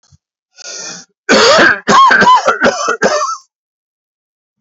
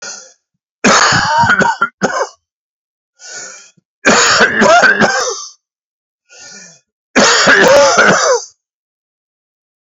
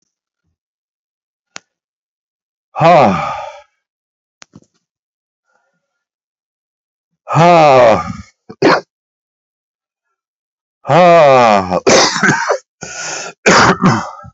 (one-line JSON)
{"cough_length": "4.6 s", "cough_amplitude": 32768, "cough_signal_mean_std_ratio": 0.58, "three_cough_length": "9.8 s", "three_cough_amplitude": 31980, "three_cough_signal_mean_std_ratio": 0.57, "exhalation_length": "14.3 s", "exhalation_amplitude": 32768, "exhalation_signal_mean_std_ratio": 0.44, "survey_phase": "beta (2021-08-13 to 2022-03-07)", "age": "45-64", "gender": "Male", "wearing_mask": "No", "symptom_cough_any": true, "symptom_runny_or_blocked_nose": true, "symptom_shortness_of_breath": true, "symptom_sore_throat": true, "symptom_fatigue": true, "symptom_fever_high_temperature": true, "symptom_change_to_sense_of_smell_or_taste": true, "smoker_status": "Never smoked", "respiratory_condition_asthma": true, "respiratory_condition_other": true, "recruitment_source": "Test and Trace", "submission_delay": "1 day", "covid_test_result": "Positive", "covid_test_method": "LFT"}